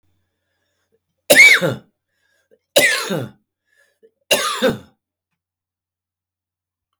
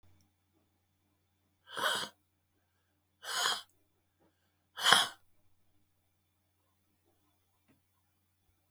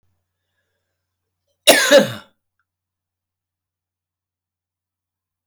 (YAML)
three_cough_length: 7.0 s
three_cough_amplitude: 32766
three_cough_signal_mean_std_ratio: 0.31
exhalation_length: 8.7 s
exhalation_amplitude: 17522
exhalation_signal_mean_std_ratio: 0.23
cough_length: 5.5 s
cough_amplitude: 32768
cough_signal_mean_std_ratio: 0.21
survey_phase: beta (2021-08-13 to 2022-03-07)
age: 65+
gender: Male
wearing_mask: 'No'
symptom_none: true
smoker_status: Never smoked
respiratory_condition_asthma: false
respiratory_condition_other: true
recruitment_source: REACT
submission_delay: 9 days
covid_test_result: Negative
covid_test_method: RT-qPCR